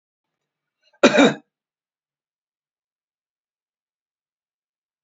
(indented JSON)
{
  "exhalation_length": "5.0 s",
  "exhalation_amplitude": 30409,
  "exhalation_signal_mean_std_ratio": 0.18,
  "survey_phase": "beta (2021-08-13 to 2022-03-07)",
  "age": "65+",
  "gender": "Male",
  "wearing_mask": "No",
  "symptom_none": true,
  "smoker_status": "Ex-smoker",
  "respiratory_condition_asthma": false,
  "respiratory_condition_other": false,
  "recruitment_source": "REACT",
  "submission_delay": "2 days",
  "covid_test_result": "Negative",
  "covid_test_method": "RT-qPCR"
}